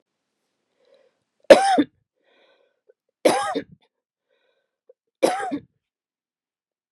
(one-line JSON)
{"three_cough_length": "6.9 s", "three_cough_amplitude": 32768, "three_cough_signal_mean_std_ratio": 0.23, "survey_phase": "beta (2021-08-13 to 2022-03-07)", "age": "45-64", "gender": "Female", "wearing_mask": "No", "symptom_none": true, "smoker_status": "Never smoked", "respiratory_condition_asthma": false, "respiratory_condition_other": false, "recruitment_source": "REACT", "submission_delay": "6 days", "covid_test_result": "Negative", "covid_test_method": "RT-qPCR", "influenza_a_test_result": "Negative", "influenza_b_test_result": "Negative"}